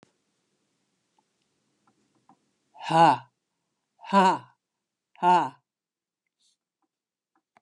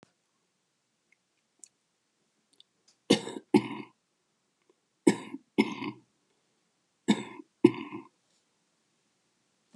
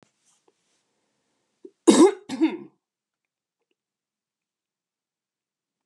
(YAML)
exhalation_length: 7.6 s
exhalation_amplitude: 15049
exhalation_signal_mean_std_ratio: 0.26
three_cough_length: 9.8 s
three_cough_amplitude: 19206
three_cough_signal_mean_std_ratio: 0.2
cough_length: 5.9 s
cough_amplitude: 28591
cough_signal_mean_std_ratio: 0.2
survey_phase: beta (2021-08-13 to 2022-03-07)
age: 65+
gender: Female
wearing_mask: 'No'
symptom_cough_any: true
smoker_status: Never smoked
respiratory_condition_asthma: false
respiratory_condition_other: false
recruitment_source: REACT
submission_delay: 2 days
covid_test_result: Negative
covid_test_method: RT-qPCR